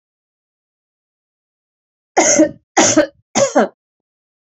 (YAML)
three_cough_length: 4.4 s
three_cough_amplitude: 30742
three_cough_signal_mean_std_ratio: 0.36
survey_phase: beta (2021-08-13 to 2022-03-07)
age: 65+
gender: Female
wearing_mask: 'No'
symptom_none: true
smoker_status: Never smoked
respiratory_condition_asthma: false
respiratory_condition_other: false
recruitment_source: REACT
submission_delay: 3 days
covid_test_result: Negative
covid_test_method: RT-qPCR
influenza_a_test_result: Negative
influenza_b_test_result: Negative